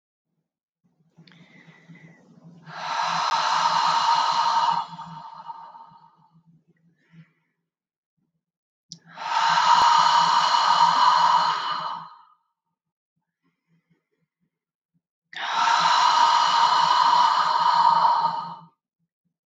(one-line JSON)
{"exhalation_length": "19.5 s", "exhalation_amplitude": 18463, "exhalation_signal_mean_std_ratio": 0.58, "survey_phase": "beta (2021-08-13 to 2022-03-07)", "age": "45-64", "gender": "Female", "wearing_mask": "No", "symptom_cough_any": true, "symptom_shortness_of_breath": true, "symptom_sore_throat": true, "smoker_status": "Never smoked", "respiratory_condition_asthma": false, "respiratory_condition_other": false, "recruitment_source": "Test and Trace", "submission_delay": "2 days", "covid_test_result": "Positive", "covid_test_method": "RT-qPCR", "covid_ct_value": 35.5, "covid_ct_gene": "ORF1ab gene"}